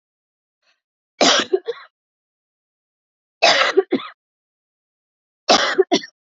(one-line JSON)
{"three_cough_length": "6.3 s", "three_cough_amplitude": 31931, "three_cough_signal_mean_std_ratio": 0.33, "survey_phase": "beta (2021-08-13 to 2022-03-07)", "age": "18-44", "gender": "Female", "wearing_mask": "No", "symptom_runny_or_blocked_nose": true, "smoker_status": "Never smoked", "respiratory_condition_asthma": false, "respiratory_condition_other": false, "recruitment_source": "Test and Trace", "submission_delay": "2 days", "covid_test_result": "Positive", "covid_test_method": "RT-qPCR", "covid_ct_value": 22.6, "covid_ct_gene": "ORF1ab gene", "covid_ct_mean": 24.0, "covid_viral_load": "13000 copies/ml", "covid_viral_load_category": "Low viral load (10K-1M copies/ml)"}